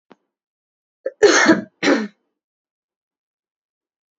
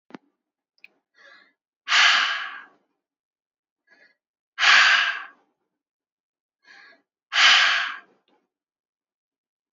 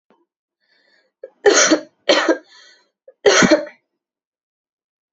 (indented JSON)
{
  "cough_length": "4.2 s",
  "cough_amplitude": 32768,
  "cough_signal_mean_std_ratio": 0.3,
  "exhalation_length": "9.7 s",
  "exhalation_amplitude": 24938,
  "exhalation_signal_mean_std_ratio": 0.33,
  "three_cough_length": "5.1 s",
  "three_cough_amplitude": 30227,
  "three_cough_signal_mean_std_ratio": 0.35,
  "survey_phase": "beta (2021-08-13 to 2022-03-07)",
  "age": "18-44",
  "gender": "Female",
  "wearing_mask": "No",
  "symptom_cough_any": true,
  "symptom_runny_or_blocked_nose": true,
  "symptom_sore_throat": true,
  "symptom_fatigue": true,
  "symptom_headache": true,
  "symptom_change_to_sense_of_smell_or_taste": true,
  "symptom_onset": "4 days",
  "smoker_status": "Ex-smoker",
  "respiratory_condition_asthma": false,
  "respiratory_condition_other": false,
  "recruitment_source": "Test and Trace",
  "submission_delay": "2 days",
  "covid_test_result": "Positive",
  "covid_test_method": "RT-qPCR",
  "covid_ct_value": 18.7,
  "covid_ct_gene": "ORF1ab gene",
  "covid_ct_mean": 19.1,
  "covid_viral_load": "550000 copies/ml",
  "covid_viral_load_category": "Low viral load (10K-1M copies/ml)"
}